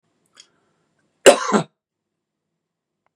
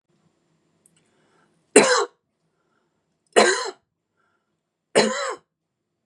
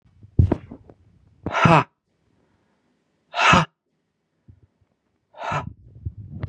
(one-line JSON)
{"cough_length": "3.2 s", "cough_amplitude": 32768, "cough_signal_mean_std_ratio": 0.2, "three_cough_length": "6.1 s", "three_cough_amplitude": 32469, "three_cough_signal_mean_std_ratio": 0.28, "exhalation_length": "6.5 s", "exhalation_amplitude": 32088, "exhalation_signal_mean_std_ratio": 0.31, "survey_phase": "beta (2021-08-13 to 2022-03-07)", "age": "45-64", "gender": "Male", "wearing_mask": "No", "symptom_cough_any": true, "symptom_onset": "12 days", "smoker_status": "Never smoked", "respiratory_condition_asthma": false, "respiratory_condition_other": false, "recruitment_source": "REACT", "submission_delay": "4 days", "covid_test_result": "Negative", "covid_test_method": "RT-qPCR", "influenza_a_test_result": "Negative", "influenza_b_test_result": "Negative"}